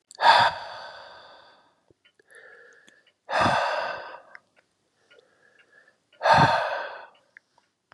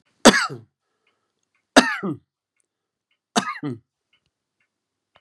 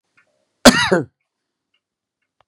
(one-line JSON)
{"exhalation_length": "7.9 s", "exhalation_amplitude": 24717, "exhalation_signal_mean_std_ratio": 0.37, "three_cough_length": "5.2 s", "three_cough_amplitude": 32767, "three_cough_signal_mean_std_ratio": 0.23, "cough_length": "2.5 s", "cough_amplitude": 32768, "cough_signal_mean_std_ratio": 0.25, "survey_phase": "beta (2021-08-13 to 2022-03-07)", "age": "65+", "gender": "Male", "wearing_mask": "No", "symptom_none": true, "smoker_status": "Ex-smoker", "respiratory_condition_asthma": false, "respiratory_condition_other": false, "recruitment_source": "REACT", "submission_delay": "2 days", "covid_test_result": "Negative", "covid_test_method": "RT-qPCR", "influenza_a_test_result": "Negative", "influenza_b_test_result": "Negative"}